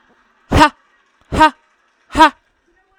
exhalation_length: 3.0 s
exhalation_amplitude: 32768
exhalation_signal_mean_std_ratio: 0.32
survey_phase: alpha (2021-03-01 to 2021-08-12)
age: 18-44
gender: Female
wearing_mask: 'No'
symptom_none: true
smoker_status: Never smoked
respiratory_condition_asthma: true
respiratory_condition_other: false
recruitment_source: REACT
submission_delay: 3 days
covid_test_result: Negative
covid_test_method: RT-qPCR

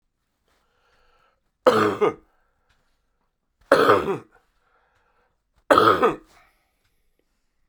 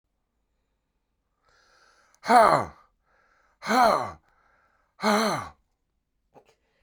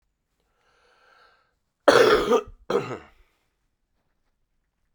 three_cough_length: 7.7 s
three_cough_amplitude: 32767
three_cough_signal_mean_std_ratio: 0.31
exhalation_length: 6.8 s
exhalation_amplitude: 20795
exhalation_signal_mean_std_ratio: 0.31
cough_length: 4.9 s
cough_amplitude: 29284
cough_signal_mean_std_ratio: 0.29
survey_phase: beta (2021-08-13 to 2022-03-07)
age: 65+
gender: Male
wearing_mask: 'No'
symptom_fatigue: true
symptom_change_to_sense_of_smell_or_taste: true
symptom_onset: 5 days
smoker_status: Never smoked
respiratory_condition_asthma: false
respiratory_condition_other: false
recruitment_source: Test and Trace
submission_delay: 3 days
covid_test_result: Positive
covid_test_method: RT-qPCR
covid_ct_value: 26.2
covid_ct_gene: ORF1ab gene
covid_ct_mean: 26.8
covid_viral_load: 1600 copies/ml
covid_viral_load_category: Minimal viral load (< 10K copies/ml)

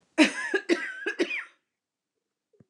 three_cough_length: 2.7 s
three_cough_amplitude: 20335
three_cough_signal_mean_std_ratio: 0.4
survey_phase: beta (2021-08-13 to 2022-03-07)
age: 65+
gender: Female
wearing_mask: 'No'
symptom_none: true
smoker_status: Never smoked
respiratory_condition_asthma: false
respiratory_condition_other: false
recruitment_source: REACT
submission_delay: 2 days
covid_test_result: Positive
covid_test_method: RT-qPCR
covid_ct_value: 25.4
covid_ct_gene: N gene
influenza_a_test_result: Negative
influenza_b_test_result: Negative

